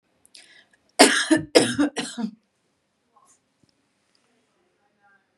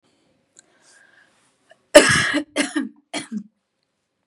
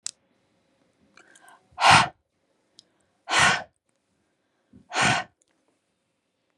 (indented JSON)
{
  "three_cough_length": "5.4 s",
  "three_cough_amplitude": 32504,
  "three_cough_signal_mean_std_ratio": 0.28,
  "cough_length": "4.3 s",
  "cough_amplitude": 32768,
  "cough_signal_mean_std_ratio": 0.28,
  "exhalation_length": "6.6 s",
  "exhalation_amplitude": 26324,
  "exhalation_signal_mean_std_ratio": 0.28,
  "survey_phase": "beta (2021-08-13 to 2022-03-07)",
  "age": "18-44",
  "gender": "Female",
  "wearing_mask": "No",
  "symptom_none": true,
  "smoker_status": "Never smoked",
  "respiratory_condition_asthma": false,
  "respiratory_condition_other": false,
  "recruitment_source": "REACT",
  "submission_delay": "1 day",
  "covid_test_result": "Negative",
  "covid_test_method": "RT-qPCR",
  "influenza_a_test_result": "Unknown/Void",
  "influenza_b_test_result": "Unknown/Void"
}